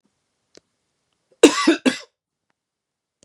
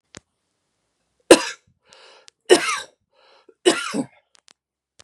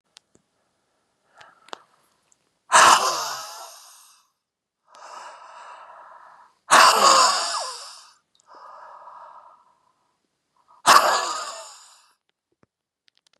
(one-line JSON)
{"cough_length": "3.2 s", "cough_amplitude": 32768, "cough_signal_mean_std_ratio": 0.23, "three_cough_length": "5.0 s", "three_cough_amplitude": 32768, "three_cough_signal_mean_std_ratio": 0.23, "exhalation_length": "13.4 s", "exhalation_amplitude": 32015, "exhalation_signal_mean_std_ratio": 0.31, "survey_phase": "beta (2021-08-13 to 2022-03-07)", "age": "45-64", "gender": "Male", "wearing_mask": "No", "symptom_runny_or_blocked_nose": true, "symptom_fatigue": true, "symptom_headache": true, "symptom_onset": "6 days", "smoker_status": "Ex-smoker", "respiratory_condition_asthma": true, "respiratory_condition_other": false, "recruitment_source": "REACT", "submission_delay": "0 days", "covid_test_result": "Negative", "covid_test_method": "RT-qPCR", "influenza_a_test_result": "Negative", "influenza_b_test_result": "Negative"}